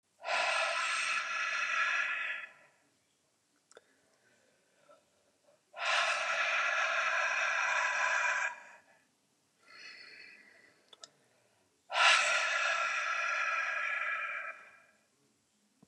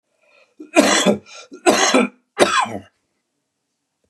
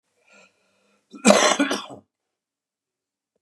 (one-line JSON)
{"exhalation_length": "15.9 s", "exhalation_amplitude": 7923, "exhalation_signal_mean_std_ratio": 0.63, "three_cough_length": "4.1 s", "three_cough_amplitude": 32768, "three_cough_signal_mean_std_ratio": 0.43, "cough_length": "3.4 s", "cough_amplitude": 32768, "cough_signal_mean_std_ratio": 0.29, "survey_phase": "beta (2021-08-13 to 2022-03-07)", "age": "65+", "gender": "Male", "wearing_mask": "No", "symptom_cough_any": true, "symptom_runny_or_blocked_nose": true, "symptom_sore_throat": true, "smoker_status": "Never smoked", "respiratory_condition_asthma": false, "respiratory_condition_other": false, "recruitment_source": "REACT", "submission_delay": "3 days", "covid_test_result": "Negative", "covid_test_method": "RT-qPCR", "influenza_a_test_result": "Negative", "influenza_b_test_result": "Negative"}